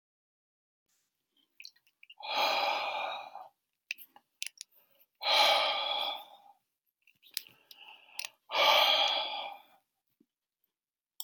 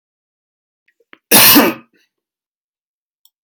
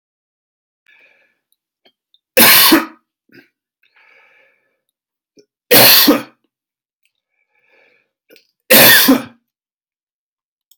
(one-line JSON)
{"exhalation_length": "11.2 s", "exhalation_amplitude": 9721, "exhalation_signal_mean_std_ratio": 0.41, "cough_length": "3.4 s", "cough_amplitude": 32768, "cough_signal_mean_std_ratio": 0.29, "three_cough_length": "10.8 s", "three_cough_amplitude": 32768, "three_cough_signal_mean_std_ratio": 0.31, "survey_phase": "beta (2021-08-13 to 2022-03-07)", "age": "65+", "gender": "Male", "wearing_mask": "No", "symptom_none": true, "smoker_status": "Ex-smoker", "respiratory_condition_asthma": false, "respiratory_condition_other": false, "recruitment_source": "REACT", "submission_delay": "1 day", "covid_test_result": "Negative", "covid_test_method": "RT-qPCR"}